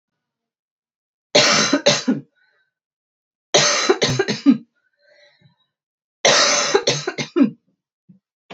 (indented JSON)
{
  "three_cough_length": "8.5 s",
  "three_cough_amplitude": 32768,
  "three_cough_signal_mean_std_ratio": 0.43,
  "survey_phase": "beta (2021-08-13 to 2022-03-07)",
  "age": "18-44",
  "gender": "Female",
  "wearing_mask": "No",
  "symptom_cough_any": true,
  "symptom_runny_or_blocked_nose": true,
  "symptom_sore_throat": true,
  "symptom_fatigue": true,
  "symptom_headache": true,
  "symptom_change_to_sense_of_smell_or_taste": true,
  "symptom_loss_of_taste": true,
  "symptom_onset": "4 days",
  "smoker_status": "Never smoked",
  "respiratory_condition_asthma": false,
  "respiratory_condition_other": false,
  "recruitment_source": "Test and Trace",
  "submission_delay": "2 days",
  "covid_test_result": "Positive",
  "covid_test_method": "RT-qPCR"
}